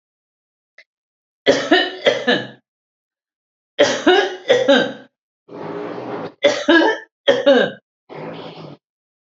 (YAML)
three_cough_length: 9.2 s
three_cough_amplitude: 29221
three_cough_signal_mean_std_ratio: 0.45
survey_phase: alpha (2021-03-01 to 2021-08-12)
age: 65+
gender: Female
wearing_mask: 'No'
symptom_none: true
symptom_onset: 12 days
smoker_status: Ex-smoker
respiratory_condition_asthma: false
respiratory_condition_other: false
recruitment_source: REACT
submission_delay: 3 days
covid_test_result: Negative
covid_test_method: RT-qPCR